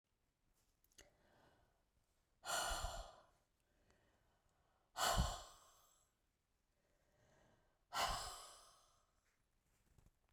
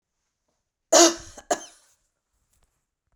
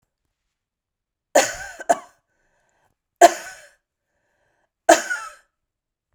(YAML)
exhalation_length: 10.3 s
exhalation_amplitude: 1780
exhalation_signal_mean_std_ratio: 0.32
cough_length: 3.2 s
cough_amplitude: 26790
cough_signal_mean_std_ratio: 0.23
three_cough_length: 6.1 s
three_cough_amplitude: 32768
three_cough_signal_mean_std_ratio: 0.21
survey_phase: beta (2021-08-13 to 2022-03-07)
age: 45-64
gender: Female
wearing_mask: 'No'
symptom_none: true
smoker_status: Ex-smoker
respiratory_condition_asthma: false
respiratory_condition_other: false
recruitment_source: REACT
submission_delay: 0 days
covid_test_result: Negative
covid_test_method: RT-qPCR
influenza_a_test_result: Unknown/Void
influenza_b_test_result: Unknown/Void